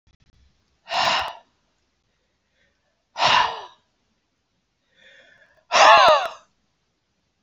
{"exhalation_length": "7.4 s", "exhalation_amplitude": 28216, "exhalation_signal_mean_std_ratio": 0.31, "survey_phase": "beta (2021-08-13 to 2022-03-07)", "age": "65+", "gender": "Male", "wearing_mask": "No", "symptom_change_to_sense_of_smell_or_taste": true, "smoker_status": "Never smoked", "respiratory_condition_asthma": false, "respiratory_condition_other": false, "recruitment_source": "REACT", "submission_delay": "1 day", "covid_test_result": "Negative", "covid_test_method": "RT-qPCR"}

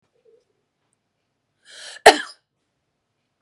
{"cough_length": "3.4 s", "cough_amplitude": 32768, "cough_signal_mean_std_ratio": 0.14, "survey_phase": "beta (2021-08-13 to 2022-03-07)", "age": "45-64", "gender": "Female", "wearing_mask": "No", "symptom_none": true, "smoker_status": "Ex-smoker", "respiratory_condition_asthma": false, "respiratory_condition_other": false, "recruitment_source": "REACT", "submission_delay": "1 day", "covid_test_result": "Negative", "covid_test_method": "RT-qPCR"}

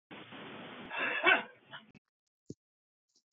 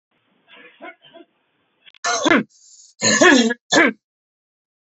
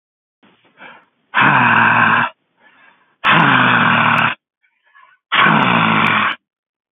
{"cough_length": "3.3 s", "cough_amplitude": 8772, "cough_signal_mean_std_ratio": 0.34, "three_cough_length": "4.9 s", "three_cough_amplitude": 32767, "three_cough_signal_mean_std_ratio": 0.38, "exhalation_length": "6.9 s", "exhalation_amplitude": 32768, "exhalation_signal_mean_std_ratio": 0.61, "survey_phase": "beta (2021-08-13 to 2022-03-07)", "age": "45-64", "gender": "Male", "wearing_mask": "No", "symptom_none": true, "smoker_status": "Ex-smoker", "respiratory_condition_asthma": false, "respiratory_condition_other": false, "recruitment_source": "REACT", "submission_delay": "2 days", "covid_test_result": "Negative", "covid_test_method": "RT-qPCR"}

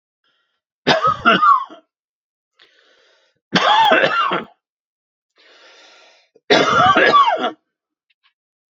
{"three_cough_length": "8.8 s", "three_cough_amplitude": 32767, "three_cough_signal_mean_std_ratio": 0.45, "survey_phase": "beta (2021-08-13 to 2022-03-07)", "age": "45-64", "gender": "Male", "wearing_mask": "No", "symptom_none": true, "smoker_status": "Ex-smoker", "respiratory_condition_asthma": false, "respiratory_condition_other": false, "recruitment_source": "REACT", "submission_delay": "0 days", "covid_test_result": "Negative", "covid_test_method": "RT-qPCR", "influenza_a_test_result": "Negative", "influenza_b_test_result": "Negative"}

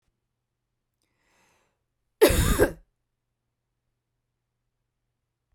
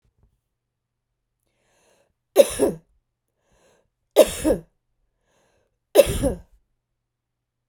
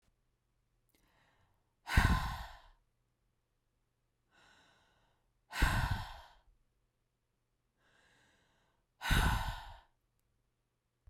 {"cough_length": "5.5 s", "cough_amplitude": 22526, "cough_signal_mean_std_ratio": 0.22, "three_cough_length": "7.7 s", "three_cough_amplitude": 32768, "three_cough_signal_mean_std_ratio": 0.23, "exhalation_length": "11.1 s", "exhalation_amplitude": 6263, "exhalation_signal_mean_std_ratio": 0.29, "survey_phase": "beta (2021-08-13 to 2022-03-07)", "age": "45-64", "gender": "Female", "wearing_mask": "No", "symptom_none": true, "smoker_status": "Never smoked", "respiratory_condition_asthma": false, "respiratory_condition_other": false, "recruitment_source": "REACT", "submission_delay": "0 days", "covid_test_result": "Negative", "covid_test_method": "RT-qPCR"}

